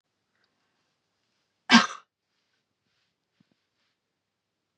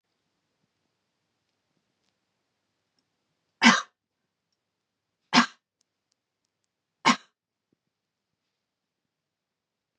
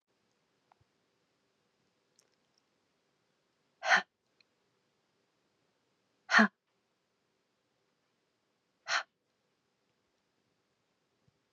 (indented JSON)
{
  "cough_length": "4.8 s",
  "cough_amplitude": 27987,
  "cough_signal_mean_std_ratio": 0.14,
  "three_cough_length": "10.0 s",
  "three_cough_amplitude": 25664,
  "three_cough_signal_mean_std_ratio": 0.15,
  "exhalation_length": "11.5 s",
  "exhalation_amplitude": 10774,
  "exhalation_signal_mean_std_ratio": 0.15,
  "survey_phase": "beta (2021-08-13 to 2022-03-07)",
  "age": "45-64",
  "gender": "Female",
  "wearing_mask": "No",
  "symptom_cough_any": true,
  "symptom_sore_throat": true,
  "symptom_fatigue": true,
  "symptom_other": true,
  "symptom_onset": "7 days",
  "smoker_status": "Never smoked",
  "respiratory_condition_asthma": false,
  "respiratory_condition_other": false,
  "recruitment_source": "Test and Trace",
  "submission_delay": "2 days",
  "covid_test_result": "Positive",
  "covid_test_method": "RT-qPCR",
  "covid_ct_value": 21.4,
  "covid_ct_gene": "N gene",
  "covid_ct_mean": 23.1,
  "covid_viral_load": "26000 copies/ml",
  "covid_viral_load_category": "Low viral load (10K-1M copies/ml)"
}